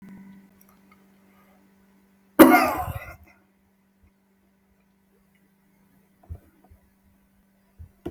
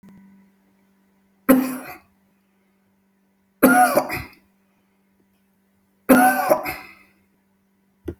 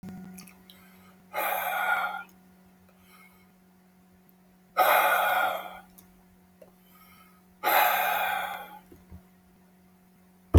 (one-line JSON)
{"cough_length": "8.1 s", "cough_amplitude": 30091, "cough_signal_mean_std_ratio": 0.19, "three_cough_length": "8.2 s", "three_cough_amplitude": 31185, "three_cough_signal_mean_std_ratio": 0.32, "exhalation_length": "10.6 s", "exhalation_amplitude": 15532, "exhalation_signal_mean_std_ratio": 0.42, "survey_phase": "alpha (2021-03-01 to 2021-08-12)", "age": "65+", "gender": "Male", "wearing_mask": "No", "symptom_none": true, "smoker_status": "Never smoked", "respiratory_condition_asthma": false, "respiratory_condition_other": false, "recruitment_source": "REACT", "submission_delay": "1 day", "covid_test_result": "Negative", "covid_test_method": "RT-qPCR"}